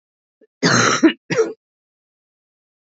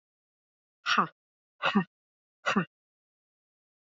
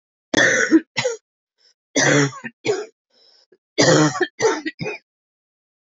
{"cough_length": "2.9 s", "cough_amplitude": 27637, "cough_signal_mean_std_ratio": 0.37, "exhalation_length": "3.8 s", "exhalation_amplitude": 9342, "exhalation_signal_mean_std_ratio": 0.29, "three_cough_length": "5.8 s", "three_cough_amplitude": 26669, "three_cough_signal_mean_std_ratio": 0.47, "survey_phase": "alpha (2021-03-01 to 2021-08-12)", "age": "45-64", "gender": "Female", "wearing_mask": "No", "symptom_new_continuous_cough": true, "symptom_shortness_of_breath": true, "symptom_fatigue": true, "symptom_fever_high_temperature": true, "symptom_headache": true, "symptom_onset": "3 days", "smoker_status": "Never smoked", "respiratory_condition_asthma": false, "respiratory_condition_other": false, "recruitment_source": "Test and Trace", "submission_delay": "2 days", "covid_test_result": "Positive", "covid_test_method": "RT-qPCR", "covid_ct_value": 17.0, "covid_ct_gene": "ORF1ab gene", "covid_ct_mean": 17.1, "covid_viral_load": "2400000 copies/ml", "covid_viral_load_category": "High viral load (>1M copies/ml)"}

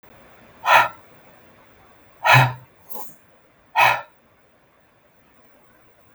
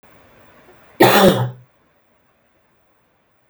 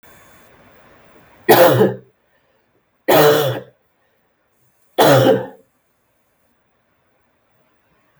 {"exhalation_length": "6.1 s", "exhalation_amplitude": 32766, "exhalation_signal_mean_std_ratio": 0.3, "cough_length": "3.5 s", "cough_amplitude": 32768, "cough_signal_mean_std_ratio": 0.31, "three_cough_length": "8.2 s", "three_cough_amplitude": 32768, "three_cough_signal_mean_std_ratio": 0.35, "survey_phase": "beta (2021-08-13 to 2022-03-07)", "age": "45-64", "gender": "Male", "wearing_mask": "No", "symptom_cough_any": true, "symptom_runny_or_blocked_nose": true, "symptom_sore_throat": true, "symptom_fatigue": true, "symptom_headache": true, "symptom_change_to_sense_of_smell_or_taste": true, "symptom_onset": "4 days", "smoker_status": "Never smoked", "respiratory_condition_asthma": false, "respiratory_condition_other": false, "recruitment_source": "Test and Trace", "submission_delay": "1 day", "covid_test_result": "Positive", "covid_test_method": "RT-qPCR", "covid_ct_value": 19.8, "covid_ct_gene": "ORF1ab gene"}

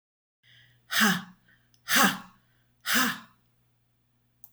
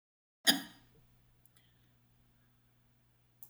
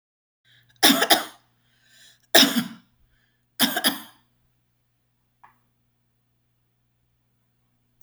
{"exhalation_length": "4.5 s", "exhalation_amplitude": 13253, "exhalation_signal_mean_std_ratio": 0.36, "cough_length": "3.5 s", "cough_amplitude": 9234, "cough_signal_mean_std_ratio": 0.18, "three_cough_length": "8.0 s", "three_cough_amplitude": 32768, "three_cough_signal_mean_std_ratio": 0.25, "survey_phase": "alpha (2021-03-01 to 2021-08-12)", "age": "65+", "gender": "Female", "wearing_mask": "No", "symptom_none": true, "smoker_status": "Never smoked", "respiratory_condition_asthma": false, "respiratory_condition_other": false, "recruitment_source": "REACT", "submission_delay": "1 day", "covid_test_result": "Negative", "covid_test_method": "RT-qPCR"}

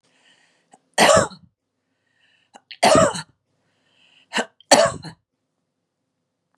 {"three_cough_length": "6.6 s", "three_cough_amplitude": 32767, "three_cough_signal_mean_std_ratio": 0.3, "survey_phase": "beta (2021-08-13 to 2022-03-07)", "age": "65+", "gender": "Female", "wearing_mask": "No", "symptom_none": true, "smoker_status": "Ex-smoker", "respiratory_condition_asthma": false, "respiratory_condition_other": false, "recruitment_source": "REACT", "submission_delay": "2 days", "covid_test_result": "Negative", "covid_test_method": "RT-qPCR", "influenza_a_test_result": "Unknown/Void", "influenza_b_test_result": "Unknown/Void"}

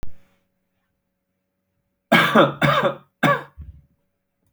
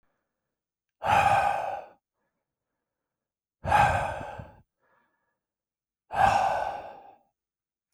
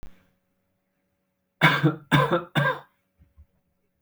{"cough_length": "4.5 s", "cough_amplitude": 28997, "cough_signal_mean_std_ratio": 0.38, "exhalation_length": "7.9 s", "exhalation_amplitude": 12865, "exhalation_signal_mean_std_ratio": 0.4, "three_cough_length": "4.0 s", "three_cough_amplitude": 24389, "three_cough_signal_mean_std_ratio": 0.36, "survey_phase": "alpha (2021-03-01 to 2021-08-12)", "age": "18-44", "gender": "Male", "wearing_mask": "No", "symptom_none": true, "smoker_status": "Ex-smoker", "respiratory_condition_asthma": false, "respiratory_condition_other": false, "recruitment_source": "REACT", "submission_delay": "3 days", "covid_test_result": "Negative", "covid_test_method": "RT-qPCR"}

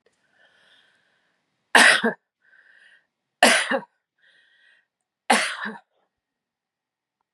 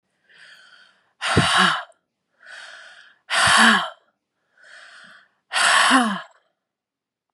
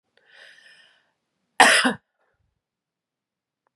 {"three_cough_length": "7.3 s", "three_cough_amplitude": 30206, "three_cough_signal_mean_std_ratio": 0.27, "exhalation_length": "7.3 s", "exhalation_amplitude": 26793, "exhalation_signal_mean_std_ratio": 0.42, "cough_length": "3.8 s", "cough_amplitude": 32767, "cough_signal_mean_std_ratio": 0.23, "survey_phase": "beta (2021-08-13 to 2022-03-07)", "age": "65+", "gender": "Female", "wearing_mask": "No", "symptom_cough_any": true, "symptom_new_continuous_cough": true, "symptom_runny_or_blocked_nose": true, "symptom_headache": true, "symptom_onset": "3 days", "smoker_status": "Never smoked", "respiratory_condition_asthma": false, "respiratory_condition_other": false, "recruitment_source": "Test and Trace", "submission_delay": "2 days", "covid_test_result": "Positive", "covid_test_method": "RT-qPCR", "covid_ct_value": 26.5, "covid_ct_gene": "ORF1ab gene", "covid_ct_mean": 26.7, "covid_viral_load": "1800 copies/ml", "covid_viral_load_category": "Minimal viral load (< 10K copies/ml)"}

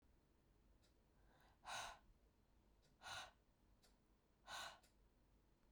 {"exhalation_length": "5.7 s", "exhalation_amplitude": 414, "exhalation_signal_mean_std_ratio": 0.46, "survey_phase": "beta (2021-08-13 to 2022-03-07)", "age": "45-64", "gender": "Female", "wearing_mask": "No", "symptom_shortness_of_breath": true, "symptom_fatigue": true, "symptom_headache": true, "smoker_status": "Current smoker (e-cigarettes or vapes only)", "respiratory_condition_asthma": false, "respiratory_condition_other": false, "recruitment_source": "REACT", "submission_delay": "15 days", "covid_test_result": "Negative", "covid_test_method": "RT-qPCR"}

